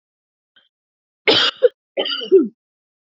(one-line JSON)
{"cough_length": "3.1 s", "cough_amplitude": 29721, "cough_signal_mean_std_ratio": 0.35, "survey_phase": "beta (2021-08-13 to 2022-03-07)", "age": "18-44", "gender": "Female", "wearing_mask": "No", "symptom_cough_any": true, "symptom_sore_throat": true, "symptom_onset": "3 days", "smoker_status": "Never smoked", "respiratory_condition_asthma": false, "respiratory_condition_other": false, "recruitment_source": "Test and Trace", "submission_delay": "2 days", "covid_test_result": "Positive", "covid_test_method": "ePCR"}